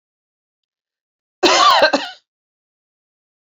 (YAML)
cough_length: 3.5 s
cough_amplitude: 28566
cough_signal_mean_std_ratio: 0.33
survey_phase: beta (2021-08-13 to 2022-03-07)
age: 45-64
gender: Female
wearing_mask: 'No'
symptom_cough_any: true
symptom_runny_or_blocked_nose: true
symptom_fatigue: true
symptom_change_to_sense_of_smell_or_taste: true
symptom_onset: 5 days
smoker_status: Ex-smoker
respiratory_condition_asthma: false
respiratory_condition_other: false
recruitment_source: Test and Trace
submission_delay: 2 days
covid_test_result: Positive
covid_test_method: RT-qPCR
covid_ct_value: 15.1
covid_ct_gene: ORF1ab gene
covid_ct_mean: 15.4
covid_viral_load: 8900000 copies/ml
covid_viral_load_category: High viral load (>1M copies/ml)